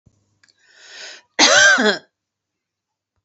cough_length: 3.2 s
cough_amplitude: 32767
cough_signal_mean_std_ratio: 0.36
survey_phase: beta (2021-08-13 to 2022-03-07)
age: 45-64
gender: Female
wearing_mask: 'No'
symptom_none: true
smoker_status: Never smoked
respiratory_condition_asthma: false
respiratory_condition_other: false
recruitment_source: REACT
submission_delay: 3 days
covid_test_result: Negative
covid_test_method: RT-qPCR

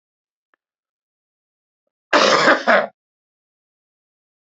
cough_length: 4.4 s
cough_amplitude: 29223
cough_signal_mean_std_ratio: 0.3
survey_phase: beta (2021-08-13 to 2022-03-07)
age: 65+
gender: Male
wearing_mask: 'No'
symptom_none: true
smoker_status: Ex-smoker
respiratory_condition_asthma: false
respiratory_condition_other: false
recruitment_source: REACT
submission_delay: 2 days
covid_test_result: Negative
covid_test_method: RT-qPCR
influenza_a_test_result: Negative
influenza_b_test_result: Negative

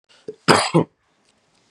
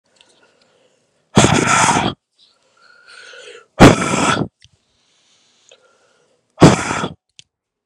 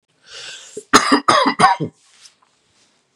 cough_length: 1.7 s
cough_amplitude: 32768
cough_signal_mean_std_ratio: 0.32
exhalation_length: 7.9 s
exhalation_amplitude: 32768
exhalation_signal_mean_std_ratio: 0.34
three_cough_length: 3.2 s
three_cough_amplitude: 32768
three_cough_signal_mean_std_ratio: 0.39
survey_phase: beta (2021-08-13 to 2022-03-07)
age: 18-44
gender: Male
wearing_mask: 'No'
symptom_cough_any: true
symptom_sore_throat: true
symptom_headache: true
symptom_onset: 4 days
smoker_status: Current smoker (1 to 10 cigarettes per day)
respiratory_condition_asthma: false
respiratory_condition_other: false
recruitment_source: Test and Trace
submission_delay: 1 day
covid_test_result: Positive
covid_test_method: RT-qPCR
covid_ct_value: 27.9
covid_ct_gene: N gene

